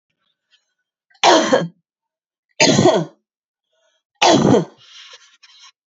{"three_cough_length": "6.0 s", "three_cough_amplitude": 32768, "three_cough_signal_mean_std_ratio": 0.38, "survey_phase": "beta (2021-08-13 to 2022-03-07)", "age": "45-64", "gender": "Female", "wearing_mask": "No", "symptom_cough_any": true, "symptom_runny_or_blocked_nose": true, "symptom_sore_throat": true, "symptom_fatigue": true, "symptom_headache": true, "symptom_onset": "4 days", "smoker_status": "Never smoked", "respiratory_condition_asthma": false, "respiratory_condition_other": false, "recruitment_source": "Test and Trace", "submission_delay": "1 day", "covid_test_result": "Positive", "covid_test_method": "RT-qPCR", "covid_ct_value": 21.8, "covid_ct_gene": "N gene"}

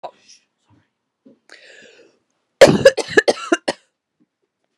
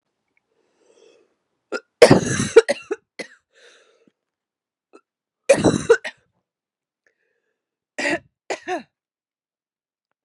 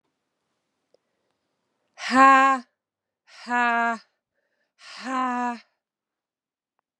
{"cough_length": "4.8 s", "cough_amplitude": 32768, "cough_signal_mean_std_ratio": 0.24, "three_cough_length": "10.2 s", "three_cough_amplitude": 32768, "three_cough_signal_mean_std_ratio": 0.23, "exhalation_length": "7.0 s", "exhalation_amplitude": 27218, "exhalation_signal_mean_std_ratio": 0.31, "survey_phase": "beta (2021-08-13 to 2022-03-07)", "age": "18-44", "gender": "Female", "wearing_mask": "No", "symptom_runny_or_blocked_nose": true, "symptom_fatigue": true, "symptom_fever_high_temperature": true, "symptom_change_to_sense_of_smell_or_taste": true, "symptom_loss_of_taste": true, "symptom_other": true, "smoker_status": "Never smoked", "respiratory_condition_asthma": false, "respiratory_condition_other": false, "recruitment_source": "Test and Trace", "submission_delay": "2 days", "covid_test_result": "Positive", "covid_test_method": "LAMP"}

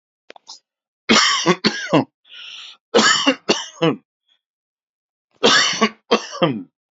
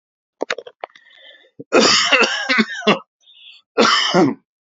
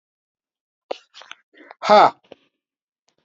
{"three_cough_length": "6.9 s", "three_cough_amplitude": 32768, "three_cough_signal_mean_std_ratio": 0.45, "cough_length": "4.6 s", "cough_amplitude": 32020, "cough_signal_mean_std_ratio": 0.51, "exhalation_length": "3.2 s", "exhalation_amplitude": 27673, "exhalation_signal_mean_std_ratio": 0.22, "survey_phase": "beta (2021-08-13 to 2022-03-07)", "age": "45-64", "gender": "Male", "wearing_mask": "No", "symptom_none": true, "smoker_status": "Current smoker (1 to 10 cigarettes per day)", "respiratory_condition_asthma": false, "respiratory_condition_other": false, "recruitment_source": "REACT", "submission_delay": "5 days", "covid_test_result": "Negative", "covid_test_method": "RT-qPCR", "influenza_a_test_result": "Negative", "influenza_b_test_result": "Negative"}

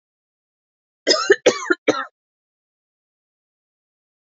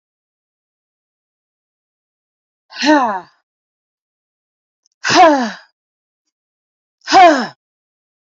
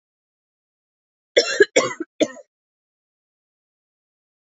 {"three_cough_length": "4.3 s", "three_cough_amplitude": 28594, "three_cough_signal_mean_std_ratio": 0.26, "exhalation_length": "8.4 s", "exhalation_amplitude": 32768, "exhalation_signal_mean_std_ratio": 0.3, "cough_length": "4.4 s", "cough_amplitude": 28193, "cough_signal_mean_std_ratio": 0.22, "survey_phase": "beta (2021-08-13 to 2022-03-07)", "age": "18-44", "gender": "Female", "wearing_mask": "No", "symptom_cough_any": true, "symptom_sore_throat": true, "symptom_diarrhoea": true, "symptom_fatigue": true, "symptom_headache": true, "symptom_change_to_sense_of_smell_or_taste": true, "symptom_onset": "1 day", "smoker_status": "Ex-smoker", "respiratory_condition_asthma": false, "respiratory_condition_other": false, "recruitment_source": "Test and Trace", "submission_delay": "1 day", "covid_test_result": "Positive", "covid_test_method": "RT-qPCR", "covid_ct_value": 21.4, "covid_ct_gene": "ORF1ab gene", "covid_ct_mean": 22.0, "covid_viral_load": "62000 copies/ml", "covid_viral_load_category": "Low viral load (10K-1M copies/ml)"}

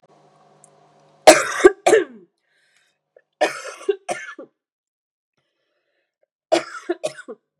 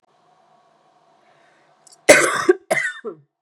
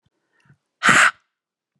{"three_cough_length": "7.6 s", "three_cough_amplitude": 32768, "three_cough_signal_mean_std_ratio": 0.25, "cough_length": "3.4 s", "cough_amplitude": 32768, "cough_signal_mean_std_ratio": 0.3, "exhalation_length": "1.8 s", "exhalation_amplitude": 32596, "exhalation_signal_mean_std_ratio": 0.31, "survey_phase": "beta (2021-08-13 to 2022-03-07)", "age": "45-64", "gender": "Female", "wearing_mask": "No", "symptom_cough_any": true, "symptom_new_continuous_cough": true, "symptom_runny_or_blocked_nose": true, "symptom_fatigue": true, "symptom_headache": true, "symptom_change_to_sense_of_smell_or_taste": true, "symptom_loss_of_taste": true, "symptom_onset": "3 days", "smoker_status": "Ex-smoker", "respiratory_condition_asthma": false, "respiratory_condition_other": false, "recruitment_source": "Test and Trace", "submission_delay": "2 days", "covid_test_result": "Positive", "covid_test_method": "RT-qPCR", "covid_ct_value": 21.9, "covid_ct_gene": "S gene", "covid_ct_mean": 22.5, "covid_viral_load": "42000 copies/ml", "covid_viral_load_category": "Low viral load (10K-1M copies/ml)"}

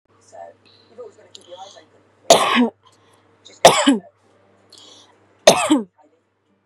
{"cough_length": "6.7 s", "cough_amplitude": 32768, "cough_signal_mean_std_ratio": 0.3, "survey_phase": "beta (2021-08-13 to 2022-03-07)", "age": "18-44", "gender": "Female", "wearing_mask": "No", "symptom_none": true, "smoker_status": "Current smoker (1 to 10 cigarettes per day)", "respiratory_condition_asthma": false, "respiratory_condition_other": false, "recruitment_source": "REACT", "submission_delay": "2 days", "covid_test_result": "Negative", "covid_test_method": "RT-qPCR"}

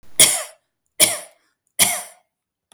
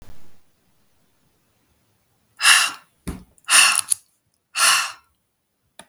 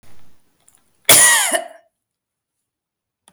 {"three_cough_length": "2.7 s", "three_cough_amplitude": 32768, "three_cough_signal_mean_std_ratio": 0.35, "exhalation_length": "5.9 s", "exhalation_amplitude": 32768, "exhalation_signal_mean_std_ratio": 0.34, "cough_length": "3.3 s", "cough_amplitude": 32768, "cough_signal_mean_std_ratio": 0.34, "survey_phase": "beta (2021-08-13 to 2022-03-07)", "age": "45-64", "gender": "Female", "wearing_mask": "No", "symptom_none": true, "smoker_status": "Never smoked", "respiratory_condition_asthma": false, "respiratory_condition_other": false, "recruitment_source": "REACT", "submission_delay": "1 day", "covid_test_result": "Negative", "covid_test_method": "RT-qPCR", "influenza_a_test_result": "Negative", "influenza_b_test_result": "Negative"}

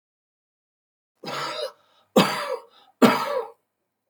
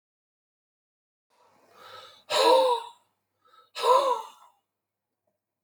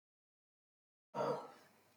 {"three_cough_length": "4.1 s", "three_cough_amplitude": 27233, "three_cough_signal_mean_std_ratio": 0.35, "exhalation_length": "5.6 s", "exhalation_amplitude": 12424, "exhalation_signal_mean_std_ratio": 0.34, "cough_length": "2.0 s", "cough_amplitude": 1452, "cough_signal_mean_std_ratio": 0.33, "survey_phase": "beta (2021-08-13 to 2022-03-07)", "age": "65+", "gender": "Male", "wearing_mask": "No", "symptom_none": true, "symptom_onset": "12 days", "smoker_status": "Ex-smoker", "respiratory_condition_asthma": false, "respiratory_condition_other": false, "recruitment_source": "REACT", "submission_delay": "7 days", "covid_test_result": "Positive", "covid_test_method": "RT-qPCR", "covid_ct_value": 19.0, "covid_ct_gene": "E gene", "influenza_a_test_result": "Negative", "influenza_b_test_result": "Negative"}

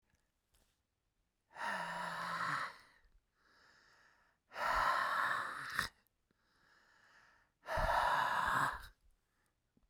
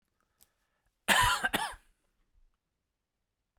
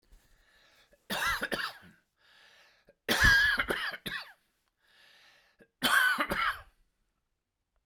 {"exhalation_length": "9.9 s", "exhalation_amplitude": 3935, "exhalation_signal_mean_std_ratio": 0.5, "cough_length": "3.6 s", "cough_amplitude": 9962, "cough_signal_mean_std_ratio": 0.3, "three_cough_length": "7.9 s", "three_cough_amplitude": 9136, "three_cough_signal_mean_std_ratio": 0.42, "survey_phase": "beta (2021-08-13 to 2022-03-07)", "age": "45-64", "gender": "Male", "wearing_mask": "No", "symptom_cough_any": true, "symptom_onset": "12 days", "smoker_status": "Ex-smoker", "respiratory_condition_asthma": false, "respiratory_condition_other": false, "recruitment_source": "REACT", "submission_delay": "1 day", "covid_test_result": "Negative", "covid_test_method": "RT-qPCR"}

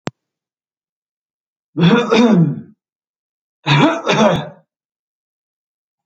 {"cough_length": "6.1 s", "cough_amplitude": 28884, "cough_signal_mean_std_ratio": 0.42, "survey_phase": "alpha (2021-03-01 to 2021-08-12)", "age": "65+", "gender": "Male", "wearing_mask": "No", "symptom_none": true, "smoker_status": "Ex-smoker", "respiratory_condition_asthma": false, "respiratory_condition_other": false, "recruitment_source": "REACT", "submission_delay": "1 day", "covid_test_result": "Negative", "covid_test_method": "RT-qPCR"}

